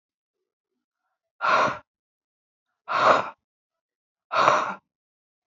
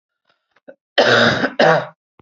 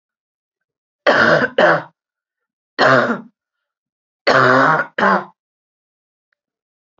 {"exhalation_length": "5.5 s", "exhalation_amplitude": 25730, "exhalation_signal_mean_std_ratio": 0.35, "cough_length": "2.2 s", "cough_amplitude": 30321, "cough_signal_mean_std_ratio": 0.49, "three_cough_length": "7.0 s", "three_cough_amplitude": 32544, "three_cough_signal_mean_std_ratio": 0.42, "survey_phase": "beta (2021-08-13 to 2022-03-07)", "age": "45-64", "gender": "Female", "wearing_mask": "No", "symptom_cough_any": true, "symptom_runny_or_blocked_nose": true, "smoker_status": "Current smoker (1 to 10 cigarettes per day)", "respiratory_condition_asthma": false, "respiratory_condition_other": false, "recruitment_source": "Test and Trace", "submission_delay": "1 day", "covid_test_result": "Positive", "covid_test_method": "RT-qPCR", "covid_ct_value": 23.7, "covid_ct_gene": "ORF1ab gene", "covid_ct_mean": 24.3, "covid_viral_load": "11000 copies/ml", "covid_viral_load_category": "Low viral load (10K-1M copies/ml)"}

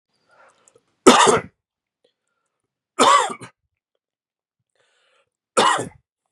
{"three_cough_length": "6.3 s", "three_cough_amplitude": 32768, "three_cough_signal_mean_std_ratio": 0.29, "survey_phase": "beta (2021-08-13 to 2022-03-07)", "age": "45-64", "gender": "Male", "wearing_mask": "No", "symptom_cough_any": true, "symptom_runny_or_blocked_nose": true, "symptom_fever_high_temperature": true, "smoker_status": "Never smoked", "respiratory_condition_asthma": false, "respiratory_condition_other": false, "recruitment_source": "Test and Trace", "submission_delay": "2 days", "covid_test_result": "Positive", "covid_test_method": "RT-qPCR", "covid_ct_value": 30.4, "covid_ct_gene": "N gene"}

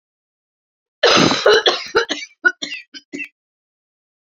{"cough_length": "4.4 s", "cough_amplitude": 31501, "cough_signal_mean_std_ratio": 0.39, "survey_phase": "beta (2021-08-13 to 2022-03-07)", "age": "45-64", "gender": "Female", "wearing_mask": "No", "symptom_cough_any": true, "symptom_shortness_of_breath": true, "symptom_sore_throat": true, "symptom_fatigue": true, "symptom_onset": "3 days", "smoker_status": "Ex-smoker", "respiratory_condition_asthma": false, "respiratory_condition_other": false, "recruitment_source": "Test and Trace", "submission_delay": "2 days", "covid_test_result": "Positive", "covid_test_method": "ePCR"}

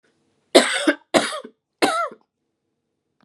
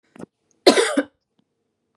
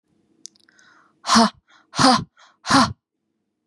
{"three_cough_length": "3.2 s", "three_cough_amplitude": 32767, "three_cough_signal_mean_std_ratio": 0.35, "cough_length": "2.0 s", "cough_amplitude": 32767, "cough_signal_mean_std_ratio": 0.29, "exhalation_length": "3.7 s", "exhalation_amplitude": 30962, "exhalation_signal_mean_std_ratio": 0.35, "survey_phase": "beta (2021-08-13 to 2022-03-07)", "age": "18-44", "gender": "Female", "wearing_mask": "No", "symptom_none": true, "smoker_status": "Never smoked", "respiratory_condition_asthma": false, "respiratory_condition_other": false, "recruitment_source": "REACT", "submission_delay": "1 day", "covid_test_result": "Negative", "covid_test_method": "RT-qPCR", "influenza_a_test_result": "Negative", "influenza_b_test_result": "Negative"}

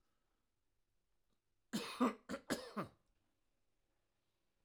{"cough_length": "4.6 s", "cough_amplitude": 2157, "cough_signal_mean_std_ratio": 0.28, "survey_phase": "alpha (2021-03-01 to 2021-08-12)", "age": "65+", "gender": "Male", "wearing_mask": "No", "symptom_none": true, "smoker_status": "Never smoked", "respiratory_condition_asthma": false, "respiratory_condition_other": false, "recruitment_source": "REACT", "submission_delay": "2 days", "covid_test_result": "Negative", "covid_test_method": "RT-qPCR"}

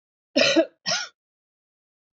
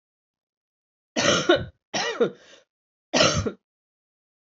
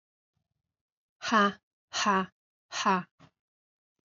{"cough_length": "2.1 s", "cough_amplitude": 16053, "cough_signal_mean_std_ratio": 0.36, "three_cough_length": "4.4 s", "three_cough_amplitude": 21797, "three_cough_signal_mean_std_ratio": 0.39, "exhalation_length": "4.1 s", "exhalation_amplitude": 9757, "exhalation_signal_mean_std_ratio": 0.35, "survey_phase": "beta (2021-08-13 to 2022-03-07)", "age": "45-64", "gender": "Female", "wearing_mask": "No", "symptom_cough_any": true, "symptom_new_continuous_cough": true, "symptom_runny_or_blocked_nose": true, "symptom_sore_throat": true, "symptom_onset": "3 days", "smoker_status": "Ex-smoker", "respiratory_condition_asthma": false, "respiratory_condition_other": false, "recruitment_source": "Test and Trace", "submission_delay": "2 days", "covid_test_result": "Positive", "covid_test_method": "RT-qPCR", "covid_ct_value": 24.8, "covid_ct_gene": "ORF1ab gene", "covid_ct_mean": 25.3, "covid_viral_load": "5100 copies/ml", "covid_viral_load_category": "Minimal viral load (< 10K copies/ml)"}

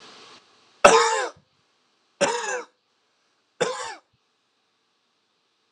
{"three_cough_length": "5.7 s", "three_cough_amplitude": 32768, "three_cough_signal_mean_std_ratio": 0.29, "survey_phase": "alpha (2021-03-01 to 2021-08-12)", "age": "18-44", "gender": "Male", "wearing_mask": "No", "symptom_cough_any": true, "symptom_fatigue": true, "symptom_change_to_sense_of_smell_or_taste": true, "symptom_loss_of_taste": true, "symptom_onset": "3 days", "smoker_status": "Never smoked", "respiratory_condition_asthma": false, "respiratory_condition_other": false, "recruitment_source": "Test and Trace", "submission_delay": "1 day", "covid_test_result": "Positive", "covid_test_method": "RT-qPCR", "covid_ct_value": 22.8, "covid_ct_gene": "ORF1ab gene"}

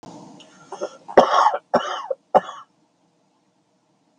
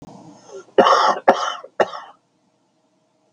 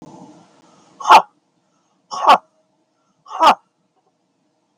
{"three_cough_length": "4.2 s", "three_cough_amplitude": 32768, "three_cough_signal_mean_std_ratio": 0.32, "cough_length": "3.3 s", "cough_amplitude": 32768, "cough_signal_mean_std_ratio": 0.37, "exhalation_length": "4.8 s", "exhalation_amplitude": 32768, "exhalation_signal_mean_std_ratio": 0.26, "survey_phase": "beta (2021-08-13 to 2022-03-07)", "age": "65+", "gender": "Male", "wearing_mask": "No", "symptom_cough_any": true, "symptom_runny_or_blocked_nose": true, "smoker_status": "Never smoked", "respiratory_condition_asthma": false, "respiratory_condition_other": false, "recruitment_source": "REACT", "submission_delay": "3 days", "covid_test_result": "Negative", "covid_test_method": "RT-qPCR"}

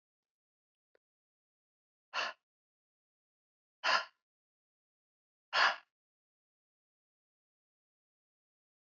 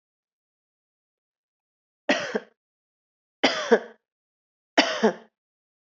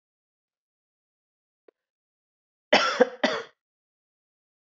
{"exhalation_length": "9.0 s", "exhalation_amplitude": 5933, "exhalation_signal_mean_std_ratio": 0.18, "three_cough_length": "5.8 s", "three_cough_amplitude": 23901, "three_cough_signal_mean_std_ratio": 0.26, "cough_length": "4.6 s", "cough_amplitude": 26310, "cough_signal_mean_std_ratio": 0.23, "survey_phase": "beta (2021-08-13 to 2022-03-07)", "age": "45-64", "gender": "Female", "wearing_mask": "No", "symptom_cough_any": true, "symptom_sore_throat": true, "symptom_fatigue": true, "symptom_fever_high_temperature": true, "symptom_headache": true, "smoker_status": "Never smoked", "respiratory_condition_asthma": false, "respiratory_condition_other": false, "recruitment_source": "Test and Trace", "submission_delay": "2 days", "covid_test_result": "Positive", "covid_test_method": "RT-qPCR", "covid_ct_value": 24.2, "covid_ct_gene": "ORF1ab gene", "covid_ct_mean": 25.5, "covid_viral_load": "4400 copies/ml", "covid_viral_load_category": "Minimal viral load (< 10K copies/ml)"}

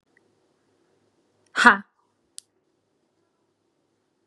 {"exhalation_length": "4.3 s", "exhalation_amplitude": 32767, "exhalation_signal_mean_std_ratio": 0.15, "survey_phase": "beta (2021-08-13 to 2022-03-07)", "age": "18-44", "gender": "Female", "wearing_mask": "No", "symptom_fatigue": true, "symptom_headache": true, "smoker_status": "Never smoked", "respiratory_condition_asthma": false, "respiratory_condition_other": false, "recruitment_source": "REACT", "submission_delay": "1 day", "covid_test_result": "Negative", "covid_test_method": "RT-qPCR", "influenza_a_test_result": "Negative", "influenza_b_test_result": "Negative"}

